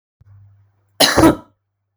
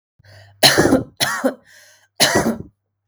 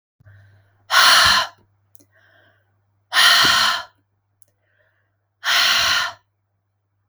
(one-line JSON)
{"cough_length": "2.0 s", "cough_amplitude": 32768, "cough_signal_mean_std_ratio": 0.34, "three_cough_length": "3.1 s", "three_cough_amplitude": 32768, "three_cough_signal_mean_std_ratio": 0.47, "exhalation_length": "7.1 s", "exhalation_amplitude": 32766, "exhalation_signal_mean_std_ratio": 0.43, "survey_phase": "beta (2021-08-13 to 2022-03-07)", "age": "18-44", "gender": "Female", "wearing_mask": "No", "symptom_none": true, "smoker_status": "Never smoked", "respiratory_condition_asthma": false, "respiratory_condition_other": false, "recruitment_source": "REACT", "submission_delay": "2 days", "covid_test_result": "Negative", "covid_test_method": "RT-qPCR"}